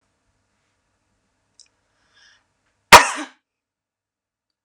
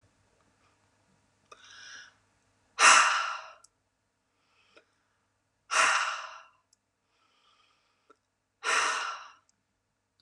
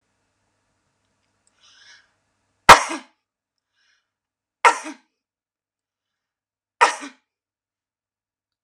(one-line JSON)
{"cough_length": "4.6 s", "cough_amplitude": 32768, "cough_signal_mean_std_ratio": 0.14, "exhalation_length": "10.2 s", "exhalation_amplitude": 16870, "exhalation_signal_mean_std_ratio": 0.29, "three_cough_length": "8.6 s", "three_cough_amplitude": 32768, "three_cough_signal_mean_std_ratio": 0.15, "survey_phase": "beta (2021-08-13 to 2022-03-07)", "age": "18-44", "gender": "Female", "wearing_mask": "No", "symptom_none": true, "smoker_status": "Never smoked", "respiratory_condition_asthma": false, "respiratory_condition_other": false, "recruitment_source": "REACT", "submission_delay": "0 days", "covid_test_result": "Negative", "covid_test_method": "RT-qPCR", "influenza_a_test_result": "Negative", "influenza_b_test_result": "Negative"}